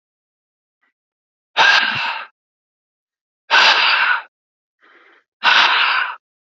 {"exhalation_length": "6.6 s", "exhalation_amplitude": 32767, "exhalation_signal_mean_std_ratio": 0.45, "survey_phase": "beta (2021-08-13 to 2022-03-07)", "age": "18-44", "gender": "Male", "wearing_mask": "No", "symptom_none": true, "symptom_onset": "7 days", "smoker_status": "Never smoked", "respiratory_condition_asthma": false, "respiratory_condition_other": false, "recruitment_source": "REACT", "submission_delay": "2 days", "covid_test_result": "Negative", "covid_test_method": "RT-qPCR"}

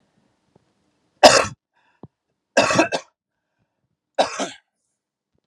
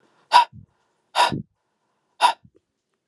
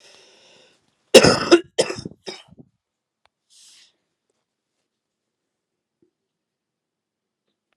{"three_cough_length": "5.5 s", "three_cough_amplitude": 32768, "three_cough_signal_mean_std_ratio": 0.26, "exhalation_length": "3.1 s", "exhalation_amplitude": 32063, "exhalation_signal_mean_std_ratio": 0.29, "cough_length": "7.8 s", "cough_amplitude": 32768, "cough_signal_mean_std_ratio": 0.18, "survey_phase": "alpha (2021-03-01 to 2021-08-12)", "age": "45-64", "gender": "Male", "wearing_mask": "No", "symptom_fatigue": true, "symptom_headache": true, "symptom_change_to_sense_of_smell_or_taste": true, "symptom_loss_of_taste": true, "symptom_onset": "3 days", "smoker_status": "Never smoked", "respiratory_condition_asthma": true, "respiratory_condition_other": false, "recruitment_source": "Test and Trace", "submission_delay": "2 days", "covid_test_result": "Positive", "covid_test_method": "RT-qPCR"}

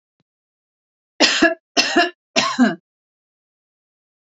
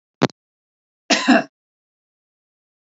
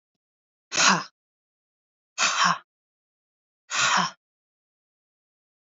{"three_cough_length": "4.3 s", "three_cough_amplitude": 32768, "three_cough_signal_mean_std_ratio": 0.36, "cough_length": "2.8 s", "cough_amplitude": 28063, "cough_signal_mean_std_ratio": 0.26, "exhalation_length": "5.7 s", "exhalation_amplitude": 18675, "exhalation_signal_mean_std_ratio": 0.33, "survey_phase": "beta (2021-08-13 to 2022-03-07)", "age": "45-64", "gender": "Female", "wearing_mask": "No", "symptom_headache": true, "smoker_status": "Ex-smoker", "respiratory_condition_asthma": false, "respiratory_condition_other": false, "recruitment_source": "Test and Trace", "submission_delay": "2 days", "covid_test_result": "Negative", "covid_test_method": "ePCR"}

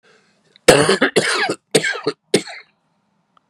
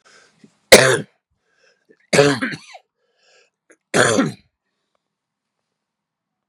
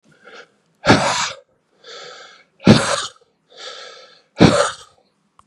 {"cough_length": "3.5 s", "cough_amplitude": 32768, "cough_signal_mean_std_ratio": 0.42, "three_cough_length": "6.5 s", "three_cough_amplitude": 32768, "three_cough_signal_mean_std_ratio": 0.28, "exhalation_length": "5.5 s", "exhalation_amplitude": 32768, "exhalation_signal_mean_std_ratio": 0.35, "survey_phase": "beta (2021-08-13 to 2022-03-07)", "age": "45-64", "gender": "Male", "wearing_mask": "No", "symptom_new_continuous_cough": true, "symptom_runny_or_blocked_nose": true, "symptom_sore_throat": true, "symptom_fatigue": true, "smoker_status": "Current smoker (11 or more cigarettes per day)", "respiratory_condition_asthma": false, "respiratory_condition_other": false, "recruitment_source": "Test and Trace", "submission_delay": "2 days", "covid_test_result": "Positive", "covid_test_method": "LFT"}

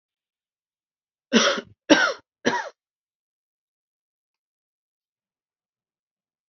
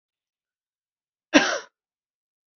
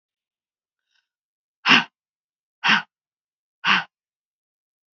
{"three_cough_length": "6.5 s", "three_cough_amplitude": 27798, "three_cough_signal_mean_std_ratio": 0.23, "cough_length": "2.6 s", "cough_amplitude": 27713, "cough_signal_mean_std_ratio": 0.2, "exhalation_length": "4.9 s", "exhalation_amplitude": 28448, "exhalation_signal_mean_std_ratio": 0.24, "survey_phase": "beta (2021-08-13 to 2022-03-07)", "age": "45-64", "gender": "Female", "wearing_mask": "No", "symptom_none": true, "smoker_status": "Never smoked", "respiratory_condition_asthma": false, "respiratory_condition_other": false, "recruitment_source": "REACT", "submission_delay": "2 days", "covid_test_result": "Negative", "covid_test_method": "RT-qPCR", "influenza_a_test_result": "Negative", "influenza_b_test_result": "Negative"}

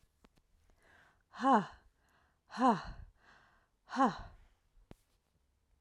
{"exhalation_length": "5.8 s", "exhalation_amplitude": 4832, "exhalation_signal_mean_std_ratio": 0.29, "survey_phase": "alpha (2021-03-01 to 2021-08-12)", "age": "45-64", "gender": "Female", "wearing_mask": "No", "symptom_shortness_of_breath": true, "symptom_abdominal_pain": true, "symptom_fatigue": true, "symptom_headache": true, "symptom_change_to_sense_of_smell_or_taste": true, "symptom_loss_of_taste": true, "symptom_onset": "3 days", "smoker_status": "Never smoked", "respiratory_condition_asthma": false, "respiratory_condition_other": false, "recruitment_source": "Test and Trace", "submission_delay": "2 days", "covid_test_result": "Positive", "covid_test_method": "RT-qPCR", "covid_ct_value": 38.4, "covid_ct_gene": "N gene"}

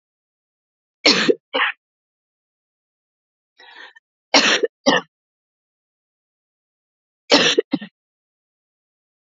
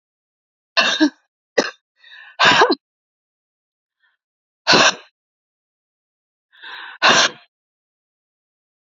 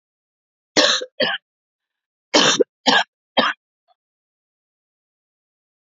{"three_cough_length": "9.4 s", "three_cough_amplitude": 32224, "three_cough_signal_mean_std_ratio": 0.27, "exhalation_length": "8.9 s", "exhalation_amplitude": 32768, "exhalation_signal_mean_std_ratio": 0.31, "cough_length": "5.8 s", "cough_amplitude": 31249, "cough_signal_mean_std_ratio": 0.32, "survey_phase": "beta (2021-08-13 to 2022-03-07)", "age": "18-44", "gender": "Female", "wearing_mask": "No", "symptom_cough_any": true, "symptom_shortness_of_breath": true, "symptom_sore_throat": true, "symptom_fatigue": true, "symptom_change_to_sense_of_smell_or_taste": true, "symptom_loss_of_taste": true, "symptom_onset": "7 days", "smoker_status": "Never smoked", "respiratory_condition_asthma": true, "respiratory_condition_other": false, "recruitment_source": "Test and Trace", "submission_delay": "2 days", "covid_test_result": "Positive", "covid_test_method": "RT-qPCR", "covid_ct_value": 17.2, "covid_ct_gene": "N gene", "covid_ct_mean": 17.7, "covid_viral_load": "1500000 copies/ml", "covid_viral_load_category": "High viral load (>1M copies/ml)"}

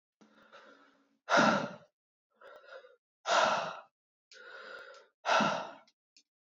{"exhalation_length": "6.5 s", "exhalation_amplitude": 6878, "exhalation_signal_mean_std_ratio": 0.37, "survey_phase": "beta (2021-08-13 to 2022-03-07)", "age": "18-44", "gender": "Male", "wearing_mask": "No", "symptom_cough_any": true, "symptom_new_continuous_cough": true, "symptom_runny_or_blocked_nose": true, "symptom_shortness_of_breath": true, "symptom_sore_throat": true, "symptom_diarrhoea": true, "symptom_fatigue": true, "symptom_fever_high_temperature": true, "symptom_headache": true, "symptom_change_to_sense_of_smell_or_taste": true, "symptom_loss_of_taste": true, "symptom_onset": "2 days", "smoker_status": "Ex-smoker", "respiratory_condition_asthma": true, "respiratory_condition_other": false, "recruitment_source": "Test and Trace", "submission_delay": "2 days", "covid_test_result": "Positive", "covid_test_method": "RT-qPCR", "covid_ct_value": 16.8, "covid_ct_gene": "ORF1ab gene", "covid_ct_mean": 17.3, "covid_viral_load": "2200000 copies/ml", "covid_viral_load_category": "High viral load (>1M copies/ml)"}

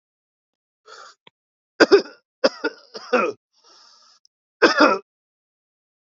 {"cough_length": "6.1 s", "cough_amplitude": 32767, "cough_signal_mean_std_ratio": 0.27, "survey_phase": "alpha (2021-03-01 to 2021-08-12)", "age": "18-44", "gender": "Male", "wearing_mask": "No", "symptom_cough_any": true, "symptom_fatigue": true, "symptom_fever_high_temperature": true, "symptom_headache": true, "symptom_loss_of_taste": true, "smoker_status": "Ex-smoker", "respiratory_condition_asthma": false, "respiratory_condition_other": false, "recruitment_source": "Test and Trace", "submission_delay": "1 day", "covid_test_result": "Positive", "covid_test_method": "RT-qPCR", "covid_ct_value": 32.5, "covid_ct_gene": "N gene"}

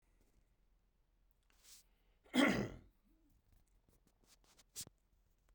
{"cough_length": "5.5 s", "cough_amplitude": 3268, "cough_signal_mean_std_ratio": 0.23, "survey_phase": "beta (2021-08-13 to 2022-03-07)", "age": "45-64", "gender": "Male", "wearing_mask": "No", "symptom_sore_throat": true, "symptom_other": true, "symptom_onset": "11 days", "smoker_status": "Never smoked", "respiratory_condition_asthma": false, "respiratory_condition_other": false, "recruitment_source": "REACT", "submission_delay": "2 days", "covid_test_result": "Negative", "covid_test_method": "RT-qPCR"}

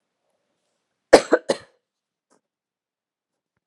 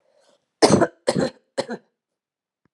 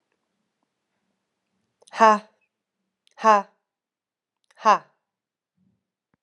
{"cough_length": "3.7 s", "cough_amplitude": 32768, "cough_signal_mean_std_ratio": 0.15, "three_cough_length": "2.7 s", "three_cough_amplitude": 30264, "three_cough_signal_mean_std_ratio": 0.32, "exhalation_length": "6.2 s", "exhalation_amplitude": 27290, "exhalation_signal_mean_std_ratio": 0.2, "survey_phase": "alpha (2021-03-01 to 2021-08-12)", "age": "18-44", "gender": "Female", "wearing_mask": "No", "symptom_cough_any": true, "symptom_headache": true, "smoker_status": "Never smoked", "respiratory_condition_asthma": false, "respiratory_condition_other": false, "recruitment_source": "Test and Trace", "submission_delay": "2 days", "covid_test_result": "Positive", "covid_test_method": "RT-qPCR"}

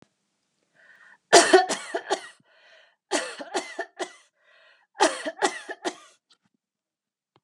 {"cough_length": "7.4 s", "cough_amplitude": 32577, "cough_signal_mean_std_ratio": 0.29, "survey_phase": "beta (2021-08-13 to 2022-03-07)", "age": "45-64", "gender": "Female", "wearing_mask": "No", "symptom_none": true, "smoker_status": "Never smoked", "respiratory_condition_asthma": false, "respiratory_condition_other": false, "recruitment_source": "REACT", "submission_delay": "2 days", "covid_test_result": "Negative", "covid_test_method": "RT-qPCR", "influenza_a_test_result": "Negative", "influenza_b_test_result": "Negative"}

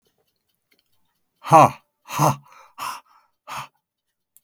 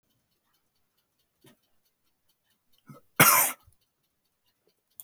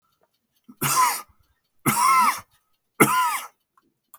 {"exhalation_length": "4.4 s", "exhalation_amplitude": 32768, "exhalation_signal_mean_std_ratio": 0.25, "cough_length": "5.0 s", "cough_amplitude": 21168, "cough_signal_mean_std_ratio": 0.2, "three_cough_length": "4.2 s", "three_cough_amplitude": 32417, "three_cough_signal_mean_std_ratio": 0.46, "survey_phase": "beta (2021-08-13 to 2022-03-07)", "age": "65+", "gender": "Male", "wearing_mask": "No", "symptom_none": true, "smoker_status": "Never smoked", "respiratory_condition_asthma": false, "respiratory_condition_other": false, "recruitment_source": "REACT", "submission_delay": "0 days", "covid_test_result": "Negative", "covid_test_method": "RT-qPCR"}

